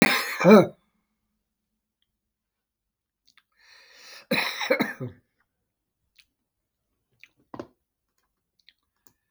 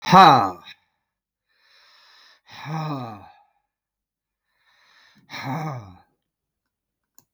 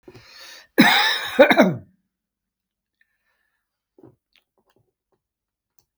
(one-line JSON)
{"three_cough_length": "9.3 s", "three_cough_amplitude": 24781, "three_cough_signal_mean_std_ratio": 0.22, "exhalation_length": "7.3 s", "exhalation_amplitude": 32768, "exhalation_signal_mean_std_ratio": 0.24, "cough_length": "6.0 s", "cough_amplitude": 32766, "cough_signal_mean_std_ratio": 0.28, "survey_phase": "beta (2021-08-13 to 2022-03-07)", "age": "65+", "gender": "Male", "wearing_mask": "No", "symptom_none": true, "smoker_status": "Never smoked", "respiratory_condition_asthma": false, "respiratory_condition_other": false, "recruitment_source": "REACT", "submission_delay": "2 days", "covid_test_result": "Negative", "covid_test_method": "RT-qPCR", "influenza_a_test_result": "Negative", "influenza_b_test_result": "Negative"}